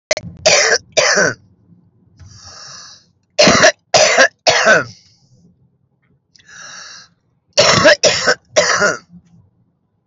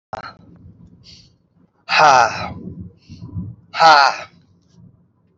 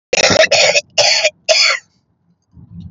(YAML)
three_cough_length: 10.1 s
three_cough_amplitude: 32768
three_cough_signal_mean_std_ratio: 0.46
exhalation_length: 5.4 s
exhalation_amplitude: 28719
exhalation_signal_mean_std_ratio: 0.36
cough_length: 2.9 s
cough_amplitude: 32211
cough_signal_mean_std_ratio: 0.58
survey_phase: alpha (2021-03-01 to 2021-08-12)
age: 45-64
gender: Female
wearing_mask: 'No'
symptom_cough_any: true
symptom_shortness_of_breath: true
symptom_fatigue: true
symptom_onset: 12 days
smoker_status: Current smoker (1 to 10 cigarettes per day)
respiratory_condition_asthma: true
respiratory_condition_other: true
recruitment_source: REACT
submission_delay: 1 day
covid_test_result: Negative
covid_test_method: RT-qPCR